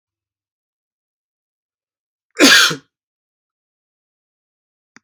{"cough_length": "5.0 s", "cough_amplitude": 32768, "cough_signal_mean_std_ratio": 0.21, "survey_phase": "beta (2021-08-13 to 2022-03-07)", "age": "18-44", "gender": "Male", "wearing_mask": "No", "symptom_none": true, "smoker_status": "Never smoked", "respiratory_condition_asthma": false, "respiratory_condition_other": false, "recruitment_source": "REACT", "submission_delay": "1 day", "covid_test_result": "Negative", "covid_test_method": "RT-qPCR"}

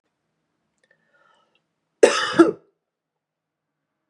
{"cough_length": "4.1 s", "cough_amplitude": 31848, "cough_signal_mean_std_ratio": 0.21, "survey_phase": "beta (2021-08-13 to 2022-03-07)", "age": "18-44", "gender": "Male", "wearing_mask": "No", "symptom_runny_or_blocked_nose": true, "symptom_fatigue": true, "symptom_onset": "5 days", "smoker_status": "Ex-smoker", "respiratory_condition_asthma": false, "respiratory_condition_other": false, "recruitment_source": "Test and Trace", "submission_delay": "2 days", "covid_test_result": "Positive", "covid_test_method": "ePCR"}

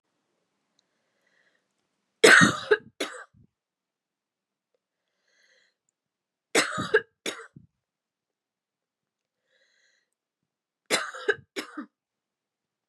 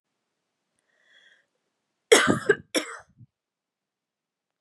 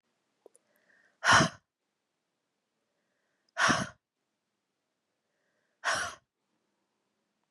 {"three_cough_length": "12.9 s", "three_cough_amplitude": 26105, "three_cough_signal_mean_std_ratio": 0.21, "cough_length": "4.6 s", "cough_amplitude": 29108, "cough_signal_mean_std_ratio": 0.22, "exhalation_length": "7.5 s", "exhalation_amplitude": 12375, "exhalation_signal_mean_std_ratio": 0.23, "survey_phase": "beta (2021-08-13 to 2022-03-07)", "age": "18-44", "gender": "Female", "wearing_mask": "No", "symptom_cough_any": true, "symptom_runny_or_blocked_nose": true, "symptom_sore_throat": true, "symptom_fatigue": true, "smoker_status": "Never smoked", "respiratory_condition_asthma": false, "respiratory_condition_other": false, "recruitment_source": "Test and Trace", "submission_delay": "1 day", "covid_test_result": "Positive", "covid_test_method": "RT-qPCR", "covid_ct_value": 14.8, "covid_ct_gene": "ORF1ab gene", "covid_ct_mean": 15.4, "covid_viral_load": "9100000 copies/ml", "covid_viral_load_category": "High viral load (>1M copies/ml)"}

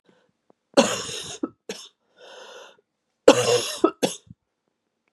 {"cough_length": "5.1 s", "cough_amplitude": 32768, "cough_signal_mean_std_ratio": 0.3, "survey_phase": "beta (2021-08-13 to 2022-03-07)", "age": "45-64", "gender": "Female", "wearing_mask": "No", "symptom_cough_any": true, "symptom_runny_or_blocked_nose": true, "symptom_sore_throat": true, "symptom_abdominal_pain": true, "symptom_diarrhoea": true, "symptom_fatigue": true, "symptom_fever_high_temperature": true, "symptom_headache": true, "symptom_loss_of_taste": true, "smoker_status": "Never smoked", "respiratory_condition_asthma": false, "respiratory_condition_other": false, "recruitment_source": "REACT", "submission_delay": "7 days", "covid_test_result": "Negative", "covid_test_method": "RT-qPCR", "influenza_a_test_result": "Negative", "influenza_b_test_result": "Negative"}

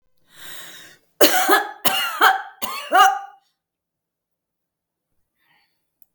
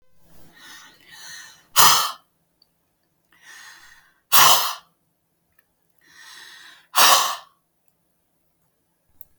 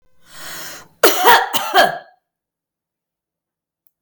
{"three_cough_length": "6.1 s", "three_cough_amplitude": 32768, "three_cough_signal_mean_std_ratio": 0.37, "exhalation_length": "9.4 s", "exhalation_amplitude": 32768, "exhalation_signal_mean_std_ratio": 0.28, "cough_length": "4.0 s", "cough_amplitude": 32768, "cough_signal_mean_std_ratio": 0.36, "survey_phase": "beta (2021-08-13 to 2022-03-07)", "age": "65+", "gender": "Female", "wearing_mask": "No", "symptom_none": true, "smoker_status": "Ex-smoker", "respiratory_condition_asthma": false, "respiratory_condition_other": false, "recruitment_source": "REACT", "submission_delay": "7 days", "covid_test_result": "Negative", "covid_test_method": "RT-qPCR", "influenza_a_test_result": "Negative", "influenza_b_test_result": "Negative"}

